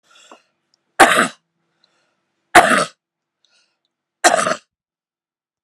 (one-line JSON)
{"three_cough_length": "5.6 s", "three_cough_amplitude": 32768, "three_cough_signal_mean_std_ratio": 0.28, "survey_phase": "alpha (2021-03-01 to 2021-08-12)", "age": "65+", "gender": "Female", "wearing_mask": "No", "symptom_none": true, "smoker_status": "Ex-smoker", "respiratory_condition_asthma": false, "respiratory_condition_other": false, "recruitment_source": "REACT", "submission_delay": "1 day", "covid_test_result": "Negative", "covid_test_method": "RT-qPCR"}